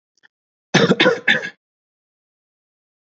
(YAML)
cough_length: 3.2 s
cough_amplitude: 27703
cough_signal_mean_std_ratio: 0.32
survey_phase: beta (2021-08-13 to 2022-03-07)
age: 18-44
gender: Male
wearing_mask: 'No'
symptom_none: true
smoker_status: Never smoked
respiratory_condition_asthma: false
respiratory_condition_other: false
recruitment_source: REACT
submission_delay: 1 day
covid_test_result: Negative
covid_test_method: RT-qPCR
influenza_a_test_result: Negative
influenza_b_test_result: Negative